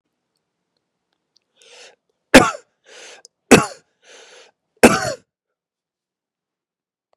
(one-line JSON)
{"three_cough_length": "7.2 s", "three_cough_amplitude": 32768, "three_cough_signal_mean_std_ratio": 0.19, "survey_phase": "beta (2021-08-13 to 2022-03-07)", "age": "45-64", "gender": "Male", "wearing_mask": "No", "symptom_cough_any": true, "symptom_runny_or_blocked_nose": true, "symptom_sore_throat": true, "symptom_fatigue": true, "symptom_change_to_sense_of_smell_or_taste": true, "symptom_onset": "6 days", "smoker_status": "Never smoked", "respiratory_condition_asthma": false, "respiratory_condition_other": false, "recruitment_source": "Test and Trace", "submission_delay": "1 day", "covid_test_result": "Positive", "covid_test_method": "RT-qPCR", "covid_ct_value": 27.2, "covid_ct_gene": "ORF1ab gene", "covid_ct_mean": 28.1, "covid_viral_load": "610 copies/ml", "covid_viral_load_category": "Minimal viral load (< 10K copies/ml)"}